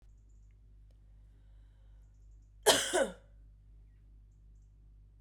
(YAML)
cough_length: 5.2 s
cough_amplitude: 10900
cough_signal_mean_std_ratio: 0.29
survey_phase: beta (2021-08-13 to 2022-03-07)
age: 45-64
gender: Female
wearing_mask: 'No'
symptom_cough_any: true
symptom_runny_or_blocked_nose: true
symptom_fatigue: true
symptom_headache: true
symptom_change_to_sense_of_smell_or_taste: true
symptom_other: true
smoker_status: Ex-smoker
respiratory_condition_asthma: false
respiratory_condition_other: false
recruitment_source: Test and Trace
submission_delay: 2 days
covid_test_result: Positive
covid_test_method: RT-qPCR
covid_ct_value: 20.4
covid_ct_gene: ORF1ab gene
covid_ct_mean: 21.1
covid_viral_load: 120000 copies/ml
covid_viral_load_category: Low viral load (10K-1M copies/ml)